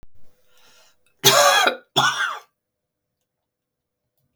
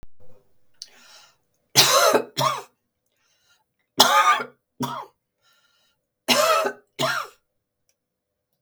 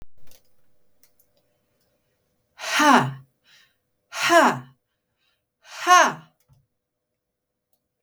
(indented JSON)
{
  "cough_length": "4.4 s",
  "cough_amplitude": 32768,
  "cough_signal_mean_std_ratio": 0.36,
  "three_cough_length": "8.6 s",
  "three_cough_amplitude": 32768,
  "three_cough_signal_mean_std_ratio": 0.38,
  "exhalation_length": "8.0 s",
  "exhalation_amplitude": 26387,
  "exhalation_signal_mean_std_ratio": 0.3,
  "survey_phase": "beta (2021-08-13 to 2022-03-07)",
  "age": "65+",
  "gender": "Female",
  "wearing_mask": "No",
  "symptom_none": true,
  "symptom_onset": "2 days",
  "smoker_status": "Never smoked",
  "respiratory_condition_asthma": false,
  "respiratory_condition_other": false,
  "recruitment_source": "REACT",
  "submission_delay": "15 days",
  "covid_test_result": "Negative",
  "covid_test_method": "RT-qPCR",
  "influenza_a_test_result": "Negative",
  "influenza_b_test_result": "Negative"
}